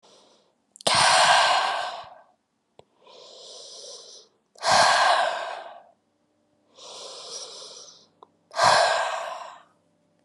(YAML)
exhalation_length: 10.2 s
exhalation_amplitude: 19067
exhalation_signal_mean_std_ratio: 0.45
survey_phase: beta (2021-08-13 to 2022-03-07)
age: 18-44
gender: Female
wearing_mask: 'No'
symptom_cough_any: true
symptom_runny_or_blocked_nose: true
symptom_fatigue: true
symptom_headache: true
symptom_change_to_sense_of_smell_or_taste: true
symptom_loss_of_taste: true
symptom_onset: 14 days
smoker_status: Never smoked
respiratory_condition_asthma: false
respiratory_condition_other: false
recruitment_source: Test and Trace
submission_delay: 12 days
covid_test_result: Negative
covid_test_method: RT-qPCR